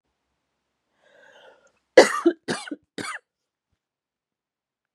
cough_length: 4.9 s
cough_amplitude: 32768
cough_signal_mean_std_ratio: 0.19
survey_phase: beta (2021-08-13 to 2022-03-07)
age: 18-44
gender: Female
wearing_mask: 'No'
symptom_cough_any: true
symptom_sore_throat: true
symptom_fatigue: true
symptom_onset: 2 days
smoker_status: Never smoked
respiratory_condition_asthma: false
respiratory_condition_other: false
recruitment_source: Test and Trace
submission_delay: 1 day
covid_test_result: Negative
covid_test_method: RT-qPCR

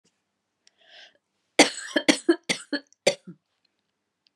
three_cough_length: 4.4 s
three_cough_amplitude: 28386
three_cough_signal_mean_std_ratio: 0.24
survey_phase: beta (2021-08-13 to 2022-03-07)
age: 45-64
gender: Female
wearing_mask: 'No'
symptom_new_continuous_cough: true
symptom_runny_or_blocked_nose: true
symptom_shortness_of_breath: true
symptom_sore_throat: true
symptom_fatigue: true
symptom_fever_high_temperature: true
symptom_headache: true
symptom_change_to_sense_of_smell_or_taste: true
symptom_onset: 3 days
smoker_status: Never smoked
respiratory_condition_asthma: false
respiratory_condition_other: false
recruitment_source: Test and Trace
submission_delay: 2 days
covid_test_result: Positive
covid_test_method: RT-qPCR
covid_ct_value: 25.1
covid_ct_gene: ORF1ab gene
covid_ct_mean: 25.7
covid_viral_load: 3700 copies/ml
covid_viral_load_category: Minimal viral load (< 10K copies/ml)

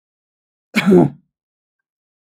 cough_length: 2.2 s
cough_amplitude: 32236
cough_signal_mean_std_ratio: 0.3
survey_phase: beta (2021-08-13 to 2022-03-07)
age: 18-44
gender: Male
wearing_mask: 'No'
symptom_none: true
smoker_status: Never smoked
respiratory_condition_asthma: false
respiratory_condition_other: false
recruitment_source: REACT
submission_delay: 2 days
covid_test_result: Negative
covid_test_method: RT-qPCR
influenza_a_test_result: Negative
influenza_b_test_result: Negative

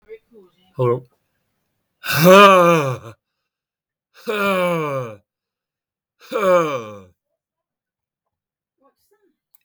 exhalation_length: 9.6 s
exhalation_amplitude: 32766
exhalation_signal_mean_std_ratio: 0.36
survey_phase: beta (2021-08-13 to 2022-03-07)
age: 65+
gender: Male
wearing_mask: 'No'
symptom_none: true
smoker_status: Never smoked
respiratory_condition_asthma: false
respiratory_condition_other: false
recruitment_source: REACT
submission_delay: 1 day
covid_test_result: Negative
covid_test_method: RT-qPCR
influenza_a_test_result: Negative
influenza_b_test_result: Negative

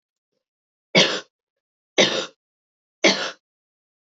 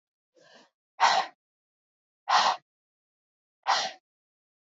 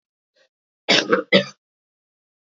three_cough_length: 4.1 s
three_cough_amplitude: 26934
three_cough_signal_mean_std_ratio: 0.3
exhalation_length: 4.8 s
exhalation_amplitude: 10914
exhalation_signal_mean_std_ratio: 0.31
cough_length: 2.5 s
cough_amplitude: 28206
cough_signal_mean_std_ratio: 0.3
survey_phase: beta (2021-08-13 to 2022-03-07)
age: 18-44
gender: Female
wearing_mask: 'No'
symptom_cough_any: true
symptom_runny_or_blocked_nose: true
symptom_shortness_of_breath: true
symptom_fatigue: true
symptom_other: true
symptom_onset: 3 days
smoker_status: Never smoked
respiratory_condition_asthma: false
respiratory_condition_other: false
recruitment_source: Test and Trace
submission_delay: 1 day
covid_test_result: Positive
covid_test_method: RT-qPCR
covid_ct_value: 12.0
covid_ct_gene: ORF1ab gene
covid_ct_mean: 12.1
covid_viral_load: 100000000 copies/ml
covid_viral_load_category: High viral load (>1M copies/ml)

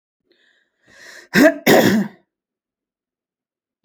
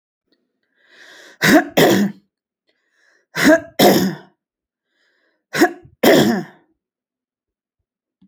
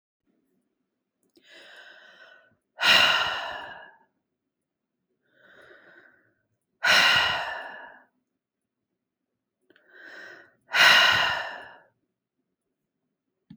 cough_length: 3.8 s
cough_amplitude: 28837
cough_signal_mean_std_ratio: 0.32
three_cough_length: 8.3 s
three_cough_amplitude: 32767
three_cough_signal_mean_std_ratio: 0.37
exhalation_length: 13.6 s
exhalation_amplitude: 20523
exhalation_signal_mean_std_ratio: 0.32
survey_phase: beta (2021-08-13 to 2022-03-07)
age: 45-64
gender: Female
wearing_mask: 'No'
symptom_none: true
smoker_status: Never smoked
respiratory_condition_asthma: false
respiratory_condition_other: false
recruitment_source: REACT
submission_delay: 1 day
covid_test_result: Negative
covid_test_method: RT-qPCR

